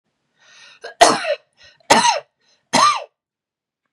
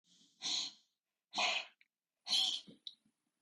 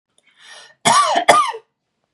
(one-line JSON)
{"three_cough_length": "3.9 s", "three_cough_amplitude": 32768, "three_cough_signal_mean_std_ratio": 0.37, "exhalation_length": "3.4 s", "exhalation_amplitude": 2750, "exhalation_signal_mean_std_ratio": 0.42, "cough_length": "2.1 s", "cough_amplitude": 32768, "cough_signal_mean_std_ratio": 0.46, "survey_phase": "beta (2021-08-13 to 2022-03-07)", "age": "18-44", "gender": "Female", "wearing_mask": "No", "symptom_none": true, "smoker_status": "Never smoked", "respiratory_condition_asthma": false, "respiratory_condition_other": false, "recruitment_source": "REACT", "submission_delay": "1 day", "covid_test_result": "Negative", "covid_test_method": "RT-qPCR", "influenza_a_test_result": "Negative", "influenza_b_test_result": "Negative"}